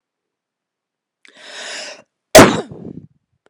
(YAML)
cough_length: 3.5 s
cough_amplitude: 32768
cough_signal_mean_std_ratio: 0.23
survey_phase: beta (2021-08-13 to 2022-03-07)
age: 18-44
gender: Female
wearing_mask: 'No'
symptom_cough_any: true
symptom_onset: 3 days
smoker_status: Ex-smoker
respiratory_condition_asthma: false
respiratory_condition_other: false
recruitment_source: REACT
submission_delay: 1 day
covid_test_result: Negative
covid_test_method: RT-qPCR